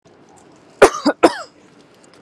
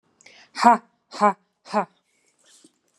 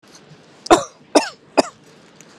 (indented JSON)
{
  "cough_length": "2.2 s",
  "cough_amplitude": 32768,
  "cough_signal_mean_std_ratio": 0.27,
  "exhalation_length": "3.0 s",
  "exhalation_amplitude": 32140,
  "exhalation_signal_mean_std_ratio": 0.26,
  "three_cough_length": "2.4 s",
  "three_cough_amplitude": 32768,
  "three_cough_signal_mean_std_ratio": 0.27,
  "survey_phase": "beta (2021-08-13 to 2022-03-07)",
  "age": "18-44",
  "gender": "Female",
  "wearing_mask": "No",
  "symptom_none": true,
  "smoker_status": "Never smoked",
  "respiratory_condition_asthma": false,
  "respiratory_condition_other": false,
  "recruitment_source": "REACT",
  "submission_delay": "1 day",
  "covid_test_result": "Negative",
  "covid_test_method": "RT-qPCR",
  "influenza_a_test_result": "Unknown/Void",
  "influenza_b_test_result": "Unknown/Void"
}